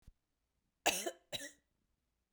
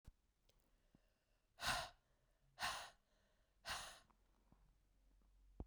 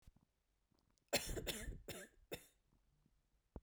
{"cough_length": "2.3 s", "cough_amplitude": 3941, "cough_signal_mean_std_ratio": 0.28, "exhalation_length": "5.7 s", "exhalation_amplitude": 1170, "exhalation_signal_mean_std_ratio": 0.34, "three_cough_length": "3.6 s", "three_cough_amplitude": 2322, "three_cough_signal_mean_std_ratio": 0.37, "survey_phase": "beta (2021-08-13 to 2022-03-07)", "age": "45-64", "gender": "Female", "wearing_mask": "No", "symptom_cough_any": true, "symptom_runny_or_blocked_nose": true, "symptom_shortness_of_breath": true, "symptom_fatigue": true, "symptom_headache": true, "symptom_other": true, "symptom_onset": "3 days", "smoker_status": "Never smoked", "respiratory_condition_asthma": false, "respiratory_condition_other": false, "recruitment_source": "Test and Trace", "submission_delay": "1 day", "covid_test_result": "Positive", "covid_test_method": "RT-qPCR"}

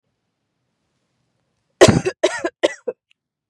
{"cough_length": "3.5 s", "cough_amplitude": 32768, "cough_signal_mean_std_ratio": 0.26, "survey_phase": "beta (2021-08-13 to 2022-03-07)", "age": "18-44", "gender": "Female", "wearing_mask": "No", "symptom_none": true, "smoker_status": "Ex-smoker", "respiratory_condition_asthma": true, "respiratory_condition_other": false, "recruitment_source": "REACT", "submission_delay": "4 days", "covid_test_result": "Negative", "covid_test_method": "RT-qPCR"}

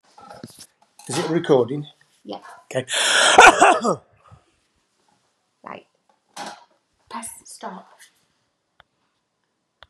{"cough_length": "9.9 s", "cough_amplitude": 32768, "cough_signal_mean_std_ratio": 0.31, "survey_phase": "beta (2021-08-13 to 2022-03-07)", "age": "45-64", "gender": "Male", "wearing_mask": "No", "symptom_cough_any": true, "symptom_runny_or_blocked_nose": true, "symptom_fatigue": true, "symptom_headache": true, "smoker_status": "Never smoked", "respiratory_condition_asthma": true, "respiratory_condition_other": false, "recruitment_source": "Test and Trace", "submission_delay": "3 days", "covid_test_result": "Positive", "covid_test_method": "RT-qPCR", "covid_ct_value": 25.6, "covid_ct_gene": "S gene", "covid_ct_mean": 26.3, "covid_viral_load": "2400 copies/ml", "covid_viral_load_category": "Minimal viral load (< 10K copies/ml)"}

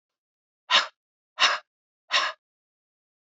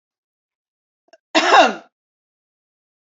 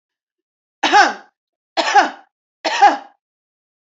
{"exhalation_length": "3.3 s", "exhalation_amplitude": 18491, "exhalation_signal_mean_std_ratio": 0.29, "cough_length": "3.2 s", "cough_amplitude": 29525, "cough_signal_mean_std_ratio": 0.26, "three_cough_length": "3.9 s", "three_cough_amplitude": 29094, "three_cough_signal_mean_std_ratio": 0.36, "survey_phase": "beta (2021-08-13 to 2022-03-07)", "age": "45-64", "gender": "Female", "wearing_mask": "No", "symptom_none": true, "smoker_status": "Current smoker (11 or more cigarettes per day)", "respiratory_condition_asthma": false, "respiratory_condition_other": false, "recruitment_source": "REACT", "submission_delay": "1 day", "covid_test_result": "Negative", "covid_test_method": "RT-qPCR", "influenza_a_test_result": "Negative", "influenza_b_test_result": "Negative"}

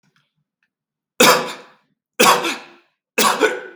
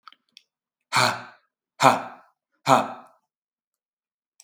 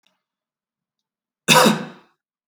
{"three_cough_length": "3.8 s", "three_cough_amplitude": 32768, "three_cough_signal_mean_std_ratio": 0.4, "exhalation_length": "4.4 s", "exhalation_amplitude": 32768, "exhalation_signal_mean_std_ratio": 0.27, "cough_length": "2.5 s", "cough_amplitude": 32768, "cough_signal_mean_std_ratio": 0.28, "survey_phase": "beta (2021-08-13 to 2022-03-07)", "age": "18-44", "gender": "Male", "wearing_mask": "No", "symptom_none": true, "smoker_status": "Never smoked", "respiratory_condition_asthma": false, "respiratory_condition_other": false, "recruitment_source": "REACT", "submission_delay": "2 days", "covid_test_result": "Negative", "covid_test_method": "RT-qPCR", "influenza_a_test_result": "Negative", "influenza_b_test_result": "Negative"}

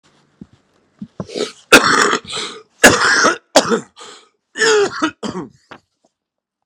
{"three_cough_length": "6.7 s", "three_cough_amplitude": 32768, "three_cough_signal_mean_std_ratio": 0.43, "survey_phase": "beta (2021-08-13 to 2022-03-07)", "age": "45-64", "gender": "Male", "wearing_mask": "No", "symptom_cough_any": true, "symptom_shortness_of_breath": true, "symptom_fatigue": true, "smoker_status": "Current smoker (11 or more cigarettes per day)", "respiratory_condition_asthma": false, "respiratory_condition_other": false, "recruitment_source": "Test and Trace", "submission_delay": "1 day", "covid_test_result": "Negative", "covid_test_method": "RT-qPCR"}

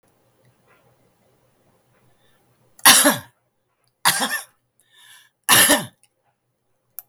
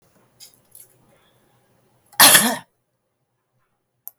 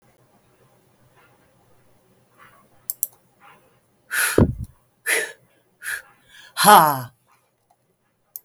{"three_cough_length": "7.1 s", "three_cough_amplitude": 32768, "three_cough_signal_mean_std_ratio": 0.28, "cough_length": "4.2 s", "cough_amplitude": 32768, "cough_signal_mean_std_ratio": 0.22, "exhalation_length": "8.4 s", "exhalation_amplitude": 32768, "exhalation_signal_mean_std_ratio": 0.26, "survey_phase": "beta (2021-08-13 to 2022-03-07)", "age": "65+", "gender": "Female", "wearing_mask": "No", "symptom_none": true, "smoker_status": "Current smoker (11 or more cigarettes per day)", "respiratory_condition_asthma": false, "respiratory_condition_other": false, "recruitment_source": "REACT", "submission_delay": "7 days", "covid_test_result": "Negative", "covid_test_method": "RT-qPCR", "influenza_a_test_result": "Unknown/Void", "influenza_b_test_result": "Unknown/Void"}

